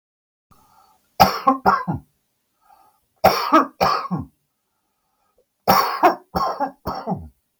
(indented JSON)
{
  "three_cough_length": "7.6 s",
  "three_cough_amplitude": 32768,
  "three_cough_signal_mean_std_ratio": 0.4,
  "survey_phase": "beta (2021-08-13 to 2022-03-07)",
  "age": "65+",
  "gender": "Male",
  "wearing_mask": "No",
  "symptom_none": true,
  "smoker_status": "Ex-smoker",
  "respiratory_condition_asthma": true,
  "respiratory_condition_other": false,
  "recruitment_source": "REACT",
  "submission_delay": "3 days",
  "covid_test_result": "Negative",
  "covid_test_method": "RT-qPCR",
  "influenza_a_test_result": "Negative",
  "influenza_b_test_result": "Negative"
}